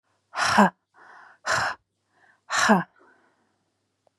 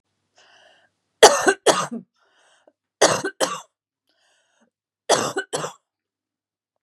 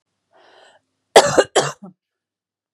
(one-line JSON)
{"exhalation_length": "4.2 s", "exhalation_amplitude": 23659, "exhalation_signal_mean_std_ratio": 0.35, "three_cough_length": "6.8 s", "three_cough_amplitude": 32768, "three_cough_signal_mean_std_ratio": 0.28, "cough_length": "2.7 s", "cough_amplitude": 32768, "cough_signal_mean_std_ratio": 0.26, "survey_phase": "beta (2021-08-13 to 2022-03-07)", "age": "18-44", "gender": "Female", "wearing_mask": "No", "symptom_cough_any": true, "symptom_new_continuous_cough": true, "symptom_runny_or_blocked_nose": true, "symptom_sore_throat": true, "symptom_fatigue": true, "symptom_onset": "5 days", "smoker_status": "Ex-smoker", "respiratory_condition_asthma": false, "respiratory_condition_other": false, "recruitment_source": "Test and Trace", "submission_delay": "1 day", "covid_test_result": "Positive", "covid_test_method": "RT-qPCR", "covid_ct_value": 20.2, "covid_ct_gene": "N gene"}